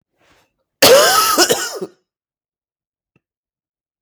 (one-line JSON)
{"cough_length": "4.0 s", "cough_amplitude": 32768, "cough_signal_mean_std_ratio": 0.38, "survey_phase": "beta (2021-08-13 to 2022-03-07)", "age": "18-44", "gender": "Male", "wearing_mask": "No", "symptom_cough_any": true, "symptom_other": true, "symptom_onset": "12 days", "smoker_status": "Never smoked", "respiratory_condition_asthma": false, "respiratory_condition_other": false, "recruitment_source": "REACT", "submission_delay": "2 days", "covid_test_result": "Negative", "covid_test_method": "RT-qPCR", "influenza_a_test_result": "Unknown/Void", "influenza_b_test_result": "Unknown/Void"}